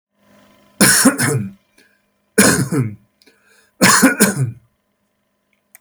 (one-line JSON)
{"three_cough_length": "5.8 s", "three_cough_amplitude": 32768, "three_cough_signal_mean_std_ratio": 0.44, "survey_phase": "beta (2021-08-13 to 2022-03-07)", "age": "65+", "gender": "Male", "wearing_mask": "No", "symptom_none": true, "symptom_onset": "4 days", "smoker_status": "Never smoked", "respiratory_condition_asthma": false, "respiratory_condition_other": false, "recruitment_source": "REACT", "submission_delay": "1 day", "covid_test_result": "Negative", "covid_test_method": "RT-qPCR", "influenza_a_test_result": "Negative", "influenza_b_test_result": "Negative"}